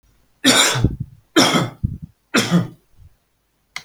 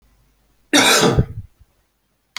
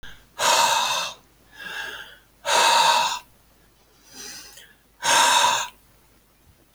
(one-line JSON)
{"three_cough_length": "3.8 s", "three_cough_amplitude": 32674, "three_cough_signal_mean_std_ratio": 0.47, "cough_length": "2.4 s", "cough_amplitude": 32768, "cough_signal_mean_std_ratio": 0.41, "exhalation_length": "6.7 s", "exhalation_amplitude": 19294, "exhalation_signal_mean_std_ratio": 0.52, "survey_phase": "alpha (2021-03-01 to 2021-08-12)", "age": "18-44", "gender": "Male", "wearing_mask": "No", "symptom_none": true, "smoker_status": "Never smoked", "respiratory_condition_asthma": false, "respiratory_condition_other": false, "recruitment_source": "REACT", "submission_delay": "2 days", "covid_test_result": "Negative", "covid_test_method": "RT-qPCR"}